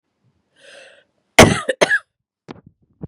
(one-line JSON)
{"cough_length": "3.1 s", "cough_amplitude": 32768, "cough_signal_mean_std_ratio": 0.26, "survey_phase": "beta (2021-08-13 to 2022-03-07)", "age": "45-64", "gender": "Female", "wearing_mask": "No", "symptom_runny_or_blocked_nose": true, "symptom_sore_throat": true, "symptom_headache": true, "symptom_onset": "4 days", "smoker_status": "Never smoked", "respiratory_condition_asthma": false, "respiratory_condition_other": false, "recruitment_source": "Test and Trace", "submission_delay": "2 days", "covid_test_result": "Positive", "covid_test_method": "RT-qPCR", "covid_ct_value": 16.8, "covid_ct_gene": "N gene", "covid_ct_mean": 16.8, "covid_viral_load": "3000000 copies/ml", "covid_viral_load_category": "High viral load (>1M copies/ml)"}